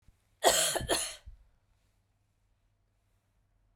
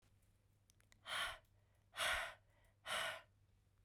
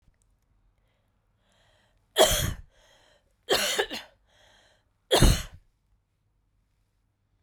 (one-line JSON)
{"cough_length": "3.8 s", "cough_amplitude": 11965, "cough_signal_mean_std_ratio": 0.31, "exhalation_length": "3.8 s", "exhalation_amplitude": 1348, "exhalation_signal_mean_std_ratio": 0.44, "three_cough_length": "7.4 s", "three_cough_amplitude": 19362, "three_cough_signal_mean_std_ratio": 0.28, "survey_phase": "beta (2021-08-13 to 2022-03-07)", "age": "45-64", "gender": "Female", "wearing_mask": "No", "symptom_cough_any": true, "symptom_runny_or_blocked_nose": true, "symptom_fatigue": true, "smoker_status": "Never smoked", "respiratory_condition_asthma": false, "respiratory_condition_other": false, "recruitment_source": "Test and Trace", "submission_delay": "2 days", "covid_test_result": "Positive", "covid_test_method": "RT-qPCR", "covid_ct_value": 26.2, "covid_ct_gene": "ORF1ab gene", "covid_ct_mean": 26.9, "covid_viral_load": "1500 copies/ml", "covid_viral_load_category": "Minimal viral load (< 10K copies/ml)"}